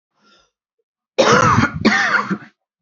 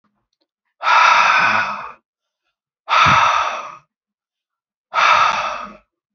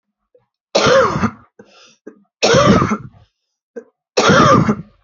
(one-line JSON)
{"cough_length": "2.8 s", "cough_amplitude": 28617, "cough_signal_mean_std_ratio": 0.52, "exhalation_length": "6.1 s", "exhalation_amplitude": 29178, "exhalation_signal_mean_std_ratio": 0.52, "three_cough_length": "5.0 s", "three_cough_amplitude": 30343, "three_cough_signal_mean_std_ratio": 0.5, "survey_phase": "beta (2021-08-13 to 2022-03-07)", "age": "18-44", "gender": "Female", "wearing_mask": "No", "symptom_cough_any": true, "symptom_new_continuous_cough": true, "symptom_runny_or_blocked_nose": true, "symptom_shortness_of_breath": true, "symptom_fatigue": true, "symptom_fever_high_temperature": true, "symptom_headache": true, "symptom_onset": "3 days", "smoker_status": "Never smoked", "respiratory_condition_asthma": false, "respiratory_condition_other": false, "recruitment_source": "Test and Trace", "submission_delay": "1 day", "covid_test_result": "Negative", "covid_test_method": "ePCR"}